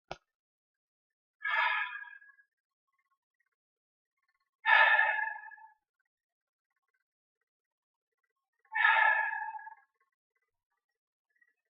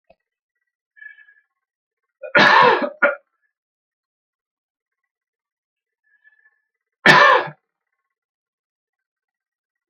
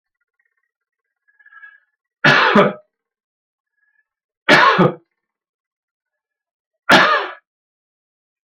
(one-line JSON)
{"exhalation_length": "11.7 s", "exhalation_amplitude": 10634, "exhalation_signal_mean_std_ratio": 0.32, "cough_length": "9.9 s", "cough_amplitude": 32328, "cough_signal_mean_std_ratio": 0.26, "three_cough_length": "8.5 s", "three_cough_amplitude": 32768, "three_cough_signal_mean_std_ratio": 0.31, "survey_phase": "alpha (2021-03-01 to 2021-08-12)", "age": "65+", "gender": "Male", "wearing_mask": "Yes", "symptom_prefer_not_to_say": true, "symptom_onset": "6 days", "smoker_status": "Ex-smoker", "respiratory_condition_asthma": false, "respiratory_condition_other": false, "recruitment_source": "REACT", "submission_delay": "2 days", "covid_test_result": "Negative", "covid_test_method": "RT-qPCR"}